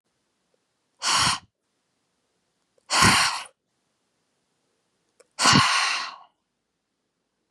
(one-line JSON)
{"exhalation_length": "7.5 s", "exhalation_amplitude": 21053, "exhalation_signal_mean_std_ratio": 0.35, "survey_phase": "beta (2021-08-13 to 2022-03-07)", "age": "18-44", "gender": "Female", "wearing_mask": "No", "symptom_runny_or_blocked_nose": true, "symptom_sore_throat": true, "symptom_headache": true, "symptom_onset": "3 days", "smoker_status": "Never smoked", "respiratory_condition_asthma": false, "respiratory_condition_other": false, "recruitment_source": "Test and Trace", "submission_delay": "2 days", "covid_test_result": "Positive", "covid_test_method": "RT-qPCR"}